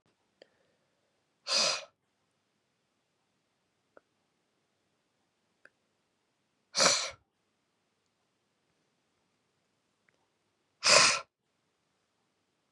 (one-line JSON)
{"exhalation_length": "12.7 s", "exhalation_amplitude": 19053, "exhalation_signal_mean_std_ratio": 0.21, "survey_phase": "beta (2021-08-13 to 2022-03-07)", "age": "18-44", "gender": "Male", "wearing_mask": "No", "symptom_cough_any": true, "symptom_runny_or_blocked_nose": true, "symptom_sore_throat": true, "symptom_onset": "3 days", "smoker_status": "Never smoked", "respiratory_condition_asthma": false, "respiratory_condition_other": false, "recruitment_source": "Test and Trace", "submission_delay": "2 days", "covid_test_result": "Positive", "covid_test_method": "RT-qPCR", "covid_ct_value": 27.9, "covid_ct_gene": "ORF1ab gene", "covid_ct_mean": 28.9, "covid_viral_load": "340 copies/ml", "covid_viral_load_category": "Minimal viral load (< 10K copies/ml)"}